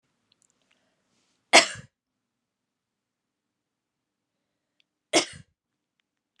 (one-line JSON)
{"cough_length": "6.4 s", "cough_amplitude": 28358, "cough_signal_mean_std_ratio": 0.14, "survey_phase": "alpha (2021-03-01 to 2021-08-12)", "age": "18-44", "gender": "Female", "wearing_mask": "No", "symptom_cough_any": true, "symptom_headache": true, "symptom_onset": "4 days", "smoker_status": "Never smoked", "respiratory_condition_asthma": false, "respiratory_condition_other": false, "recruitment_source": "Test and Trace", "submission_delay": "2 days", "covid_test_result": "Positive", "covid_test_method": "RT-qPCR"}